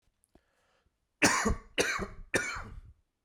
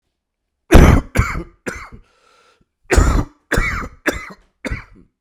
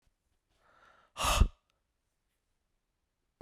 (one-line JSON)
{"three_cough_length": "3.2 s", "three_cough_amplitude": 10470, "three_cough_signal_mean_std_ratio": 0.43, "cough_length": "5.2 s", "cough_amplitude": 32768, "cough_signal_mean_std_ratio": 0.38, "exhalation_length": "3.4 s", "exhalation_amplitude": 10100, "exhalation_signal_mean_std_ratio": 0.21, "survey_phase": "alpha (2021-03-01 to 2021-08-12)", "age": "45-64", "gender": "Male", "wearing_mask": "No", "symptom_new_continuous_cough": true, "symptom_shortness_of_breath": true, "symptom_fatigue": true, "symptom_headache": true, "symptom_change_to_sense_of_smell_or_taste": true, "symptom_loss_of_taste": true, "symptom_onset": "3 days", "smoker_status": "Prefer not to say", "respiratory_condition_asthma": false, "respiratory_condition_other": false, "recruitment_source": "Test and Trace", "submission_delay": "2 days", "covid_test_result": "Positive", "covid_test_method": "RT-qPCR", "covid_ct_value": 18.2, "covid_ct_gene": "ORF1ab gene", "covid_ct_mean": 18.6, "covid_viral_load": "800000 copies/ml", "covid_viral_load_category": "Low viral load (10K-1M copies/ml)"}